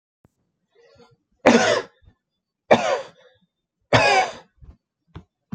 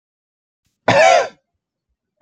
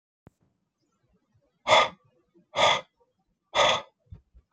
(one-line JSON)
{"three_cough_length": "5.5 s", "three_cough_amplitude": 32767, "three_cough_signal_mean_std_ratio": 0.34, "cough_length": "2.2 s", "cough_amplitude": 28333, "cough_signal_mean_std_ratio": 0.35, "exhalation_length": "4.5 s", "exhalation_amplitude": 20753, "exhalation_signal_mean_std_ratio": 0.31, "survey_phase": "beta (2021-08-13 to 2022-03-07)", "age": "18-44", "gender": "Male", "wearing_mask": "No", "symptom_cough_any": true, "symptom_new_continuous_cough": true, "symptom_runny_or_blocked_nose": true, "symptom_fatigue": true, "symptom_headache": true, "symptom_onset": "3 days", "smoker_status": "Never smoked", "respiratory_condition_asthma": false, "respiratory_condition_other": false, "recruitment_source": "Test and Trace", "submission_delay": "2 days", "covid_test_result": "Positive", "covid_test_method": "RT-qPCR", "covid_ct_value": 14.1, "covid_ct_gene": "ORF1ab gene", "covid_ct_mean": 14.4, "covid_viral_load": "19000000 copies/ml", "covid_viral_load_category": "High viral load (>1M copies/ml)"}